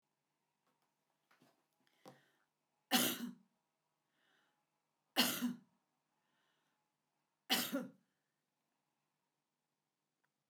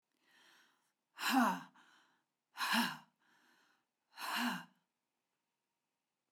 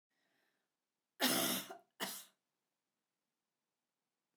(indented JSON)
{
  "three_cough_length": "10.5 s",
  "three_cough_amplitude": 4747,
  "three_cough_signal_mean_std_ratio": 0.24,
  "exhalation_length": "6.3 s",
  "exhalation_amplitude": 3681,
  "exhalation_signal_mean_std_ratio": 0.34,
  "cough_length": "4.4 s",
  "cough_amplitude": 3497,
  "cough_signal_mean_std_ratio": 0.29,
  "survey_phase": "beta (2021-08-13 to 2022-03-07)",
  "age": "65+",
  "gender": "Female",
  "wearing_mask": "No",
  "symptom_sore_throat": true,
  "smoker_status": "Ex-smoker",
  "respiratory_condition_asthma": false,
  "respiratory_condition_other": false,
  "recruitment_source": "REACT",
  "submission_delay": "0 days",
  "covid_test_result": "Negative",
  "covid_test_method": "RT-qPCR"
}